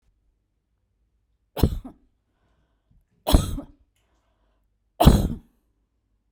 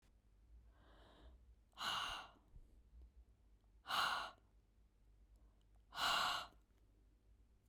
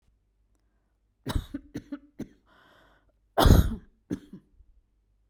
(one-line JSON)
{"three_cough_length": "6.3 s", "three_cough_amplitude": 32767, "three_cough_signal_mean_std_ratio": 0.23, "exhalation_length": "7.7 s", "exhalation_amplitude": 1446, "exhalation_signal_mean_std_ratio": 0.41, "cough_length": "5.3 s", "cough_amplitude": 19235, "cough_signal_mean_std_ratio": 0.25, "survey_phase": "beta (2021-08-13 to 2022-03-07)", "age": "45-64", "gender": "Female", "wearing_mask": "No", "symptom_cough_any": true, "symptom_runny_or_blocked_nose": true, "symptom_change_to_sense_of_smell_or_taste": true, "symptom_loss_of_taste": true, "symptom_onset": "3 days", "smoker_status": "Ex-smoker", "respiratory_condition_asthma": false, "respiratory_condition_other": false, "recruitment_source": "Test and Trace", "submission_delay": "2 days", "covid_test_result": "Positive", "covid_test_method": "RT-qPCR", "covid_ct_value": 22.7, "covid_ct_gene": "ORF1ab gene", "covid_ct_mean": 23.4, "covid_viral_load": "21000 copies/ml", "covid_viral_load_category": "Low viral load (10K-1M copies/ml)"}